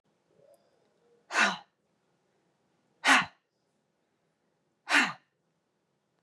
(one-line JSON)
{"exhalation_length": "6.2 s", "exhalation_amplitude": 11482, "exhalation_signal_mean_std_ratio": 0.25, "survey_phase": "beta (2021-08-13 to 2022-03-07)", "age": "45-64", "gender": "Female", "wearing_mask": "No", "symptom_cough_any": true, "symptom_new_continuous_cough": true, "symptom_runny_or_blocked_nose": true, "symptom_sore_throat": true, "symptom_other": true, "smoker_status": "Never smoked", "respiratory_condition_asthma": false, "respiratory_condition_other": false, "recruitment_source": "Test and Trace", "submission_delay": "0 days", "covid_test_result": "Positive", "covid_test_method": "RT-qPCR"}